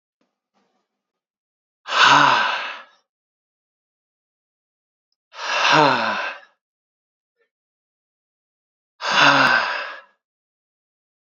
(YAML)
exhalation_length: 11.3 s
exhalation_amplitude: 28083
exhalation_signal_mean_std_ratio: 0.36
survey_phase: beta (2021-08-13 to 2022-03-07)
age: 18-44
gender: Male
wearing_mask: 'No'
symptom_cough_any: true
symptom_runny_or_blocked_nose: true
symptom_fatigue: true
symptom_change_to_sense_of_smell_or_taste: true
symptom_loss_of_taste: true
smoker_status: Never smoked
respiratory_condition_asthma: false
respiratory_condition_other: false
recruitment_source: Test and Trace
submission_delay: -1 day
covid_test_result: Positive
covid_test_method: LFT